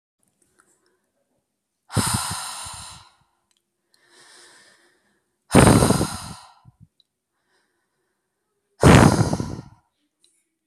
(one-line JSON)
{"exhalation_length": "10.7 s", "exhalation_amplitude": 32768, "exhalation_signal_mean_std_ratio": 0.28, "survey_phase": "alpha (2021-03-01 to 2021-08-12)", "age": "18-44", "gender": "Female", "wearing_mask": "No", "symptom_none": true, "symptom_onset": "12 days", "smoker_status": "Never smoked", "respiratory_condition_asthma": false, "respiratory_condition_other": false, "recruitment_source": "REACT", "submission_delay": "1 day", "covid_test_result": "Negative", "covid_test_method": "RT-qPCR"}